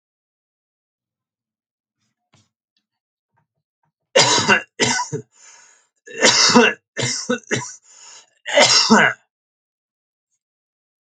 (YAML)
cough_length: 11.0 s
cough_amplitude: 32767
cough_signal_mean_std_ratio: 0.36
survey_phase: alpha (2021-03-01 to 2021-08-12)
age: 45-64
gender: Male
wearing_mask: 'No'
symptom_none: true
symptom_onset: 6 days
smoker_status: Never smoked
respiratory_condition_asthma: false
respiratory_condition_other: false
recruitment_source: REACT
submission_delay: 3 days
covid_test_result: Negative
covid_test_method: RT-qPCR